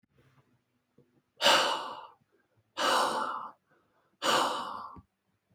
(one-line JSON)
{"exhalation_length": "5.5 s", "exhalation_amplitude": 13547, "exhalation_signal_mean_std_ratio": 0.44, "survey_phase": "beta (2021-08-13 to 2022-03-07)", "age": "18-44", "gender": "Male", "wearing_mask": "No", "symptom_fatigue": true, "smoker_status": "Never smoked", "respiratory_condition_asthma": false, "respiratory_condition_other": false, "recruitment_source": "Test and Trace", "submission_delay": "1 day", "covid_test_result": "Positive", "covid_test_method": "RT-qPCR", "covid_ct_value": 34.1, "covid_ct_gene": "ORF1ab gene"}